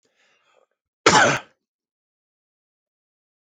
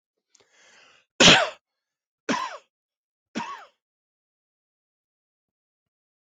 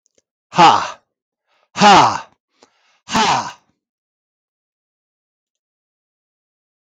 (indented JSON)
{
  "cough_length": "3.6 s",
  "cough_amplitude": 29732,
  "cough_signal_mean_std_ratio": 0.24,
  "three_cough_length": "6.2 s",
  "three_cough_amplitude": 21757,
  "three_cough_signal_mean_std_ratio": 0.21,
  "exhalation_length": "6.8 s",
  "exhalation_amplitude": 32766,
  "exhalation_signal_mean_std_ratio": 0.31,
  "survey_phase": "beta (2021-08-13 to 2022-03-07)",
  "age": "45-64",
  "gender": "Male",
  "wearing_mask": "No",
  "symptom_runny_or_blocked_nose": true,
  "smoker_status": "Never smoked",
  "respiratory_condition_asthma": false,
  "respiratory_condition_other": false,
  "recruitment_source": "Test and Trace",
  "submission_delay": "1 day",
  "covid_test_result": "Positive",
  "covid_test_method": "RT-qPCR",
  "covid_ct_value": 20.0,
  "covid_ct_gene": "ORF1ab gene",
  "covid_ct_mean": 20.3,
  "covid_viral_load": "210000 copies/ml",
  "covid_viral_load_category": "Low viral load (10K-1M copies/ml)"
}